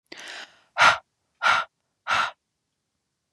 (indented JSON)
{
  "exhalation_length": "3.3 s",
  "exhalation_amplitude": 22807,
  "exhalation_signal_mean_std_ratio": 0.34,
  "survey_phase": "beta (2021-08-13 to 2022-03-07)",
  "age": "18-44",
  "gender": "Female",
  "wearing_mask": "No",
  "symptom_cough_any": true,
  "symptom_runny_or_blocked_nose": true,
  "symptom_fatigue": true,
  "symptom_headache": true,
  "symptom_change_to_sense_of_smell_or_taste": true,
  "symptom_loss_of_taste": true,
  "symptom_onset": "3 days",
  "smoker_status": "Never smoked",
  "respiratory_condition_asthma": false,
  "respiratory_condition_other": false,
  "recruitment_source": "Test and Trace",
  "submission_delay": "2 days",
  "covid_test_result": "Positive",
  "covid_test_method": "RT-qPCR",
  "covid_ct_value": 15.4,
  "covid_ct_gene": "ORF1ab gene",
  "covid_ct_mean": 15.8,
  "covid_viral_load": "6400000 copies/ml",
  "covid_viral_load_category": "High viral load (>1M copies/ml)"
}